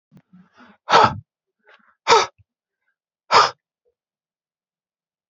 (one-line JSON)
{"exhalation_length": "5.3 s", "exhalation_amplitude": 29446, "exhalation_signal_mean_std_ratio": 0.26, "survey_phase": "beta (2021-08-13 to 2022-03-07)", "age": "45-64", "gender": "Male", "wearing_mask": "No", "symptom_sore_throat": true, "symptom_headache": true, "symptom_onset": "5 days", "smoker_status": "Ex-smoker", "respiratory_condition_asthma": false, "respiratory_condition_other": false, "recruitment_source": "REACT", "submission_delay": "1 day", "covid_test_result": "Negative", "covid_test_method": "RT-qPCR"}